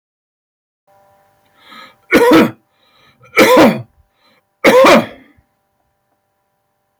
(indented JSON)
{
  "three_cough_length": "7.0 s",
  "three_cough_amplitude": 32767,
  "three_cough_signal_mean_std_ratio": 0.37,
  "survey_phase": "beta (2021-08-13 to 2022-03-07)",
  "age": "45-64",
  "gender": "Male",
  "wearing_mask": "No",
  "symptom_none": true,
  "smoker_status": "Ex-smoker",
  "respiratory_condition_asthma": false,
  "respiratory_condition_other": false,
  "recruitment_source": "REACT",
  "submission_delay": "2 days",
  "covid_test_result": "Negative",
  "covid_test_method": "RT-qPCR"
}